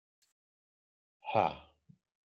{"exhalation_length": "2.4 s", "exhalation_amplitude": 5633, "exhalation_signal_mean_std_ratio": 0.22, "survey_phase": "beta (2021-08-13 to 2022-03-07)", "age": "45-64", "gender": "Male", "wearing_mask": "No", "symptom_abdominal_pain": true, "symptom_onset": "12 days", "smoker_status": "Ex-smoker", "respiratory_condition_asthma": false, "respiratory_condition_other": true, "recruitment_source": "REACT", "submission_delay": "2 days", "covid_test_result": "Negative", "covid_test_method": "RT-qPCR"}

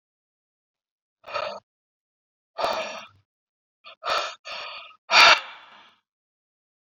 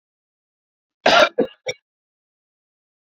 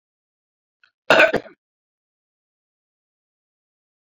{"exhalation_length": "7.0 s", "exhalation_amplitude": 27374, "exhalation_signal_mean_std_ratio": 0.27, "three_cough_length": "3.2 s", "three_cough_amplitude": 27771, "three_cough_signal_mean_std_ratio": 0.25, "cough_length": "4.2 s", "cough_amplitude": 28183, "cough_signal_mean_std_ratio": 0.19, "survey_phase": "beta (2021-08-13 to 2022-03-07)", "age": "18-44", "gender": "Female", "wearing_mask": "No", "symptom_fatigue": true, "symptom_headache": true, "symptom_change_to_sense_of_smell_or_taste": true, "symptom_loss_of_taste": true, "symptom_other": true, "smoker_status": "Never smoked", "respiratory_condition_asthma": false, "respiratory_condition_other": false, "recruitment_source": "Test and Trace", "submission_delay": "2 days", "covid_test_result": "Positive", "covid_test_method": "RT-qPCR"}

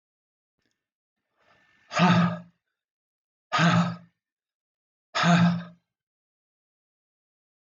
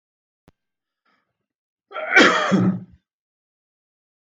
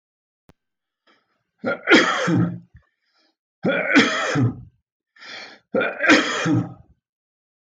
{"exhalation_length": "7.8 s", "exhalation_amplitude": 11909, "exhalation_signal_mean_std_ratio": 0.34, "cough_length": "4.3 s", "cough_amplitude": 21497, "cough_signal_mean_std_ratio": 0.33, "three_cough_length": "7.8 s", "three_cough_amplitude": 21971, "three_cough_signal_mean_std_ratio": 0.46, "survey_phase": "beta (2021-08-13 to 2022-03-07)", "age": "45-64", "gender": "Male", "wearing_mask": "No", "symptom_none": true, "symptom_onset": "7 days", "smoker_status": "Ex-smoker", "respiratory_condition_asthma": true, "respiratory_condition_other": false, "recruitment_source": "REACT", "submission_delay": "1 day", "covid_test_result": "Negative", "covid_test_method": "RT-qPCR"}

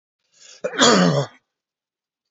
{"cough_length": "2.3 s", "cough_amplitude": 28540, "cough_signal_mean_std_ratio": 0.39, "survey_phase": "beta (2021-08-13 to 2022-03-07)", "age": "65+", "gender": "Male", "wearing_mask": "No", "symptom_runny_or_blocked_nose": true, "smoker_status": "Ex-smoker", "respiratory_condition_asthma": false, "respiratory_condition_other": false, "recruitment_source": "REACT", "submission_delay": "1 day", "covid_test_result": "Negative", "covid_test_method": "RT-qPCR", "influenza_a_test_result": "Negative", "influenza_b_test_result": "Negative"}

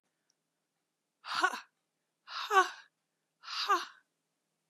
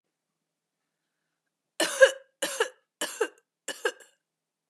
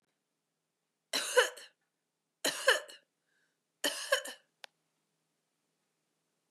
{"exhalation_length": "4.7 s", "exhalation_amplitude": 8413, "exhalation_signal_mean_std_ratio": 0.3, "cough_length": "4.7 s", "cough_amplitude": 18183, "cough_signal_mean_std_ratio": 0.25, "three_cough_length": "6.5 s", "three_cough_amplitude": 9611, "three_cough_signal_mean_std_ratio": 0.27, "survey_phase": "beta (2021-08-13 to 2022-03-07)", "age": "45-64", "gender": "Female", "wearing_mask": "No", "symptom_sore_throat": true, "symptom_headache": true, "smoker_status": "Ex-smoker", "respiratory_condition_asthma": false, "respiratory_condition_other": false, "recruitment_source": "Test and Trace", "submission_delay": "1 day", "covid_test_result": "Positive", "covid_test_method": "RT-qPCR", "covid_ct_value": 28.9, "covid_ct_gene": "ORF1ab gene", "covid_ct_mean": 29.2, "covid_viral_load": "270 copies/ml", "covid_viral_load_category": "Minimal viral load (< 10K copies/ml)"}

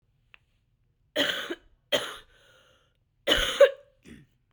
{"three_cough_length": "4.5 s", "three_cough_amplitude": 16084, "three_cough_signal_mean_std_ratio": 0.3, "survey_phase": "beta (2021-08-13 to 2022-03-07)", "age": "18-44", "gender": "Female", "wearing_mask": "No", "symptom_cough_any": true, "symptom_runny_or_blocked_nose": true, "symptom_diarrhoea": true, "symptom_fatigue": true, "smoker_status": "Ex-smoker", "respiratory_condition_asthma": true, "respiratory_condition_other": false, "recruitment_source": "Test and Trace", "submission_delay": "2 days", "covid_test_result": "Positive", "covid_test_method": "RT-qPCR", "covid_ct_value": 17.2, "covid_ct_gene": "ORF1ab gene", "covid_ct_mean": 18.2, "covid_viral_load": "1100000 copies/ml", "covid_viral_load_category": "High viral load (>1M copies/ml)"}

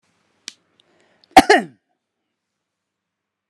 {"cough_length": "3.5 s", "cough_amplitude": 32768, "cough_signal_mean_std_ratio": 0.17, "survey_phase": "alpha (2021-03-01 to 2021-08-12)", "age": "65+", "gender": "Male", "wearing_mask": "No", "symptom_none": true, "smoker_status": "Never smoked", "respiratory_condition_asthma": false, "respiratory_condition_other": false, "recruitment_source": "REACT", "submission_delay": "1 day", "covid_test_result": "Negative", "covid_test_method": "RT-qPCR"}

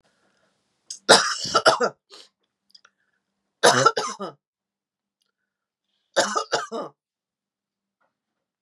{"three_cough_length": "8.6 s", "three_cough_amplitude": 32175, "three_cough_signal_mean_std_ratio": 0.29, "survey_phase": "beta (2021-08-13 to 2022-03-07)", "age": "45-64", "gender": "Female", "wearing_mask": "No", "symptom_runny_or_blocked_nose": true, "smoker_status": "Ex-smoker", "respiratory_condition_asthma": false, "respiratory_condition_other": false, "recruitment_source": "Test and Trace", "submission_delay": "1 day", "covid_test_result": "Positive", "covid_test_method": "ePCR"}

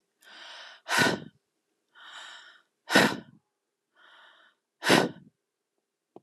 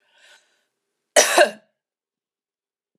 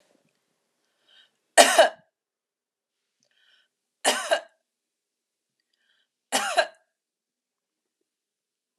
{"exhalation_length": "6.2 s", "exhalation_amplitude": 16683, "exhalation_signal_mean_std_ratio": 0.29, "cough_length": "3.0 s", "cough_amplitude": 31022, "cough_signal_mean_std_ratio": 0.24, "three_cough_length": "8.8 s", "three_cough_amplitude": 31520, "three_cough_signal_mean_std_ratio": 0.21, "survey_phase": "alpha (2021-03-01 to 2021-08-12)", "age": "45-64", "gender": "Female", "wearing_mask": "No", "symptom_none": true, "smoker_status": "Never smoked", "respiratory_condition_asthma": false, "respiratory_condition_other": false, "recruitment_source": "REACT", "submission_delay": "4 days", "covid_test_result": "Negative", "covid_test_method": "RT-qPCR"}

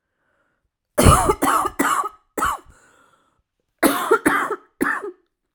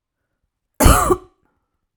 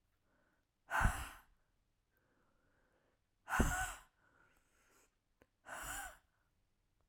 {"three_cough_length": "5.5 s", "three_cough_amplitude": 32768, "three_cough_signal_mean_std_ratio": 0.46, "cough_length": "2.0 s", "cough_amplitude": 32768, "cough_signal_mean_std_ratio": 0.32, "exhalation_length": "7.1 s", "exhalation_amplitude": 4511, "exhalation_signal_mean_std_ratio": 0.29, "survey_phase": "alpha (2021-03-01 to 2021-08-12)", "age": "18-44", "gender": "Female", "wearing_mask": "No", "symptom_cough_any": true, "symptom_shortness_of_breath": true, "symptom_headache": true, "symptom_change_to_sense_of_smell_or_taste": true, "symptom_loss_of_taste": true, "symptom_onset": "3 days", "smoker_status": "Ex-smoker", "respiratory_condition_asthma": false, "respiratory_condition_other": false, "recruitment_source": "Test and Trace", "submission_delay": "2 days", "covid_test_result": "Positive", "covid_test_method": "RT-qPCR", "covid_ct_value": 17.3, "covid_ct_gene": "ORF1ab gene", "covid_ct_mean": 17.6, "covid_viral_load": "1700000 copies/ml", "covid_viral_load_category": "High viral load (>1M copies/ml)"}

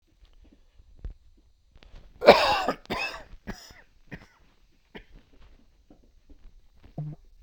{"cough_length": "7.4 s", "cough_amplitude": 32767, "cough_signal_mean_std_ratio": 0.24, "survey_phase": "beta (2021-08-13 to 2022-03-07)", "age": "45-64", "gender": "Male", "wearing_mask": "Yes", "symptom_new_continuous_cough": true, "symptom_runny_or_blocked_nose": true, "symptom_shortness_of_breath": true, "symptom_abdominal_pain": true, "symptom_fatigue": true, "symptom_fever_high_temperature": true, "symptom_headache": true, "symptom_onset": "8 days", "smoker_status": "Ex-smoker", "respiratory_condition_asthma": false, "respiratory_condition_other": false, "recruitment_source": "Test and Trace", "submission_delay": "2 days", "covid_test_result": "Positive", "covid_test_method": "RT-qPCR"}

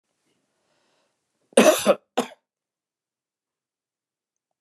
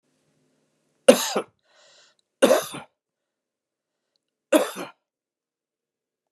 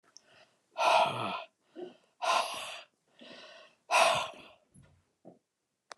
{"cough_length": "4.6 s", "cough_amplitude": 28065, "cough_signal_mean_std_ratio": 0.21, "three_cough_length": "6.3 s", "three_cough_amplitude": 29204, "three_cough_signal_mean_std_ratio": 0.22, "exhalation_length": "6.0 s", "exhalation_amplitude": 9038, "exhalation_signal_mean_std_ratio": 0.4, "survey_phase": "beta (2021-08-13 to 2022-03-07)", "age": "65+", "gender": "Male", "wearing_mask": "No", "symptom_none": true, "smoker_status": "Never smoked", "respiratory_condition_asthma": false, "respiratory_condition_other": false, "recruitment_source": "REACT", "submission_delay": "1 day", "covid_test_result": "Negative", "covid_test_method": "RT-qPCR", "influenza_a_test_result": "Negative", "influenza_b_test_result": "Negative"}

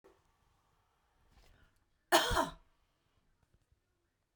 {"cough_length": "4.4 s", "cough_amplitude": 7758, "cough_signal_mean_std_ratio": 0.22, "survey_phase": "beta (2021-08-13 to 2022-03-07)", "age": "45-64", "gender": "Female", "wearing_mask": "No", "symptom_none": true, "smoker_status": "Ex-smoker", "respiratory_condition_asthma": false, "respiratory_condition_other": false, "recruitment_source": "REACT", "submission_delay": "1 day", "covid_test_result": "Negative", "covid_test_method": "RT-qPCR"}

